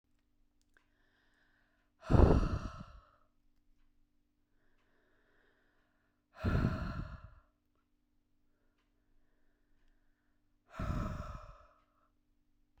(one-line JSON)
{"exhalation_length": "12.8 s", "exhalation_amplitude": 8288, "exhalation_signal_mean_std_ratio": 0.26, "survey_phase": "beta (2021-08-13 to 2022-03-07)", "age": "18-44", "gender": "Female", "wearing_mask": "No", "symptom_none": true, "smoker_status": "Ex-smoker", "respiratory_condition_asthma": false, "respiratory_condition_other": false, "recruitment_source": "REACT", "submission_delay": "7 days", "covid_test_result": "Negative", "covid_test_method": "RT-qPCR"}